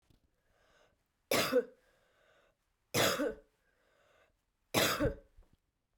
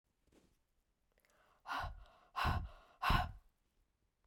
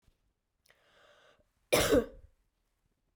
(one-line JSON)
{"three_cough_length": "6.0 s", "three_cough_amplitude": 5549, "three_cough_signal_mean_std_ratio": 0.35, "exhalation_length": "4.3 s", "exhalation_amplitude": 3799, "exhalation_signal_mean_std_ratio": 0.36, "cough_length": "3.2 s", "cough_amplitude": 7281, "cough_signal_mean_std_ratio": 0.26, "survey_phase": "beta (2021-08-13 to 2022-03-07)", "age": "45-64", "gender": "Female", "wearing_mask": "No", "symptom_none": true, "symptom_onset": "5 days", "smoker_status": "Ex-smoker", "respiratory_condition_asthma": false, "respiratory_condition_other": false, "recruitment_source": "REACT", "submission_delay": "0 days", "covid_test_result": "Negative", "covid_test_method": "RT-qPCR"}